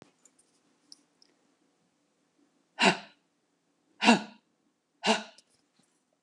{"exhalation_length": "6.2 s", "exhalation_amplitude": 17437, "exhalation_signal_mean_std_ratio": 0.22, "survey_phase": "alpha (2021-03-01 to 2021-08-12)", "age": "45-64", "gender": "Female", "wearing_mask": "No", "symptom_none": true, "smoker_status": "Ex-smoker", "respiratory_condition_asthma": false, "respiratory_condition_other": false, "recruitment_source": "REACT", "submission_delay": "2 days", "covid_test_result": "Negative", "covid_test_method": "RT-qPCR"}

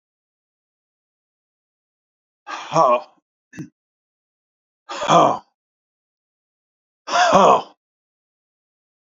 {"exhalation_length": "9.1 s", "exhalation_amplitude": 29939, "exhalation_signal_mean_std_ratio": 0.28, "survey_phase": "beta (2021-08-13 to 2022-03-07)", "age": "65+", "gender": "Male", "wearing_mask": "No", "symptom_cough_any": true, "symptom_runny_or_blocked_nose": true, "smoker_status": "Ex-smoker", "respiratory_condition_asthma": false, "respiratory_condition_other": false, "recruitment_source": "REACT", "submission_delay": "0 days", "covid_test_result": "Negative", "covid_test_method": "RT-qPCR"}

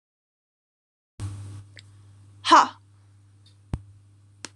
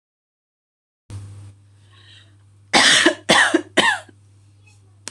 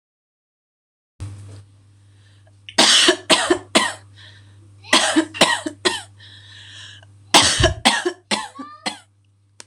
{"exhalation_length": "4.6 s", "exhalation_amplitude": 21944, "exhalation_signal_mean_std_ratio": 0.23, "cough_length": "5.1 s", "cough_amplitude": 26028, "cough_signal_mean_std_ratio": 0.37, "three_cough_length": "9.7 s", "three_cough_amplitude": 26028, "three_cough_signal_mean_std_ratio": 0.41, "survey_phase": "beta (2021-08-13 to 2022-03-07)", "age": "18-44", "gender": "Female", "wearing_mask": "No", "symptom_cough_any": true, "symptom_runny_or_blocked_nose": true, "symptom_sore_throat": true, "symptom_headache": true, "symptom_onset": "4 days", "smoker_status": "Current smoker (e-cigarettes or vapes only)", "respiratory_condition_asthma": false, "respiratory_condition_other": false, "recruitment_source": "REACT", "submission_delay": "1 day", "covid_test_result": "Positive", "covid_test_method": "RT-qPCR", "covid_ct_value": 17.0, "covid_ct_gene": "E gene", "influenza_a_test_result": "Negative", "influenza_b_test_result": "Negative"}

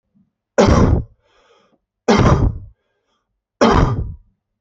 {"three_cough_length": "4.6 s", "three_cough_amplitude": 28110, "three_cough_signal_mean_std_ratio": 0.46, "survey_phase": "beta (2021-08-13 to 2022-03-07)", "age": "45-64", "gender": "Male", "wearing_mask": "No", "symptom_none": true, "smoker_status": "Ex-smoker", "respiratory_condition_asthma": false, "respiratory_condition_other": false, "recruitment_source": "REACT", "submission_delay": "2 days", "covid_test_result": "Negative", "covid_test_method": "RT-qPCR"}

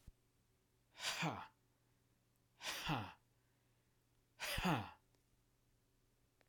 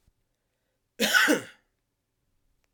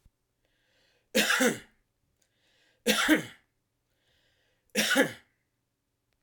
{"exhalation_length": "6.5 s", "exhalation_amplitude": 1815, "exhalation_signal_mean_std_ratio": 0.38, "cough_length": "2.7 s", "cough_amplitude": 13464, "cough_signal_mean_std_ratio": 0.31, "three_cough_length": "6.2 s", "three_cough_amplitude": 13339, "three_cough_signal_mean_std_ratio": 0.33, "survey_phase": "alpha (2021-03-01 to 2021-08-12)", "age": "45-64", "gender": "Male", "wearing_mask": "No", "symptom_none": true, "smoker_status": "Never smoked", "respiratory_condition_asthma": false, "respiratory_condition_other": false, "recruitment_source": "REACT", "submission_delay": "1 day", "covid_test_result": "Negative", "covid_test_method": "RT-qPCR"}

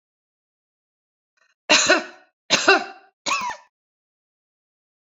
{"three_cough_length": "5.0 s", "three_cough_amplitude": 28351, "three_cough_signal_mean_std_ratio": 0.31, "survey_phase": "beta (2021-08-13 to 2022-03-07)", "age": "18-44", "gender": "Female", "wearing_mask": "No", "symptom_runny_or_blocked_nose": true, "smoker_status": "Ex-smoker", "respiratory_condition_asthma": false, "respiratory_condition_other": false, "recruitment_source": "REACT", "submission_delay": "2 days", "covid_test_result": "Negative", "covid_test_method": "RT-qPCR", "influenza_a_test_result": "Negative", "influenza_b_test_result": "Negative"}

